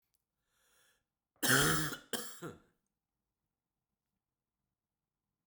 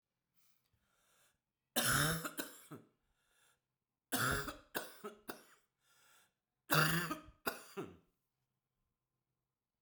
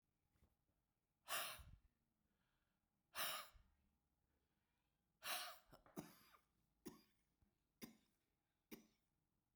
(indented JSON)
{
  "cough_length": "5.5 s",
  "cough_amplitude": 5827,
  "cough_signal_mean_std_ratio": 0.27,
  "three_cough_length": "9.8 s",
  "three_cough_amplitude": 5148,
  "three_cough_signal_mean_std_ratio": 0.34,
  "exhalation_length": "9.6 s",
  "exhalation_amplitude": 1048,
  "exhalation_signal_mean_std_ratio": 0.31,
  "survey_phase": "beta (2021-08-13 to 2022-03-07)",
  "age": "45-64",
  "gender": "Male",
  "wearing_mask": "No",
  "symptom_cough_any": true,
  "symptom_new_continuous_cough": true,
  "symptom_runny_or_blocked_nose": true,
  "symptom_onset": "2 days",
  "smoker_status": "Never smoked",
  "respiratory_condition_asthma": false,
  "respiratory_condition_other": false,
  "recruitment_source": "Test and Trace",
  "submission_delay": "1 day",
  "covid_test_result": "Positive",
  "covid_test_method": "RT-qPCR",
  "covid_ct_value": 14.5,
  "covid_ct_gene": "ORF1ab gene"
}